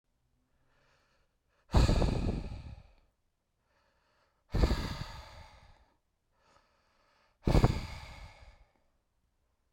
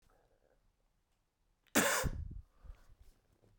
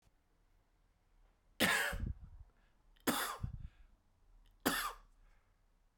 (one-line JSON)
{"exhalation_length": "9.7 s", "exhalation_amplitude": 9912, "exhalation_signal_mean_std_ratio": 0.32, "cough_length": "3.6 s", "cough_amplitude": 5689, "cough_signal_mean_std_ratio": 0.32, "three_cough_length": "6.0 s", "three_cough_amplitude": 5309, "three_cough_signal_mean_std_ratio": 0.39, "survey_phase": "beta (2021-08-13 to 2022-03-07)", "age": "18-44", "gender": "Male", "wearing_mask": "No", "symptom_cough_any": true, "symptom_sore_throat": true, "symptom_onset": "2 days", "smoker_status": "Ex-smoker", "respiratory_condition_asthma": false, "respiratory_condition_other": false, "recruitment_source": "Test and Trace", "submission_delay": "2 days", "covid_test_result": "Positive", "covid_test_method": "RT-qPCR", "covid_ct_value": 15.7, "covid_ct_gene": "ORF1ab gene", "covid_ct_mean": 16.1, "covid_viral_load": "5300000 copies/ml", "covid_viral_load_category": "High viral load (>1M copies/ml)"}